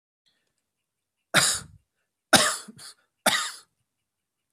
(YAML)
three_cough_length: 4.5 s
three_cough_amplitude: 27886
three_cough_signal_mean_std_ratio: 0.29
survey_phase: beta (2021-08-13 to 2022-03-07)
age: 45-64
gender: Male
wearing_mask: 'No'
symptom_cough_any: true
symptom_sore_throat: true
symptom_onset: 5 days
smoker_status: Never smoked
respiratory_condition_asthma: false
respiratory_condition_other: false
recruitment_source: Test and Trace
submission_delay: 2 days
covid_test_result: Negative
covid_test_method: RT-qPCR